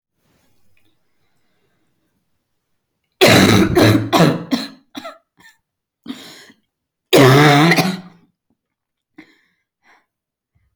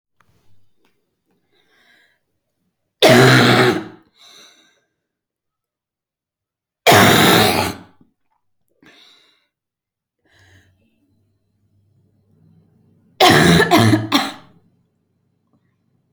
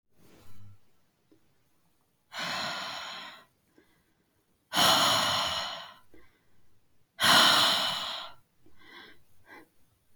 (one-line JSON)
{"cough_length": "10.8 s", "cough_amplitude": 32768, "cough_signal_mean_std_ratio": 0.37, "three_cough_length": "16.1 s", "three_cough_amplitude": 32079, "three_cough_signal_mean_std_ratio": 0.33, "exhalation_length": "10.2 s", "exhalation_amplitude": 12581, "exhalation_signal_mean_std_ratio": 0.42, "survey_phase": "alpha (2021-03-01 to 2021-08-12)", "age": "18-44", "gender": "Female", "wearing_mask": "No", "symptom_cough_any": true, "symptom_shortness_of_breath": true, "symptom_fatigue": true, "smoker_status": "Never smoked", "respiratory_condition_asthma": false, "respiratory_condition_other": false, "recruitment_source": "Test and Trace", "submission_delay": "2 days", "covid_test_result": "Positive", "covid_test_method": "RT-qPCR", "covid_ct_value": 29.8, "covid_ct_gene": "ORF1ab gene", "covid_ct_mean": 30.3, "covid_viral_load": "110 copies/ml", "covid_viral_load_category": "Minimal viral load (< 10K copies/ml)"}